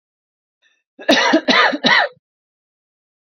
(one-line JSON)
{"three_cough_length": "3.2 s", "three_cough_amplitude": 30623, "three_cough_signal_mean_std_ratio": 0.43, "survey_phase": "beta (2021-08-13 to 2022-03-07)", "age": "18-44", "gender": "Female", "wearing_mask": "No", "symptom_none": true, "smoker_status": "Ex-smoker", "respiratory_condition_asthma": false, "respiratory_condition_other": false, "recruitment_source": "REACT", "submission_delay": "2 days", "covid_test_result": "Negative", "covid_test_method": "RT-qPCR"}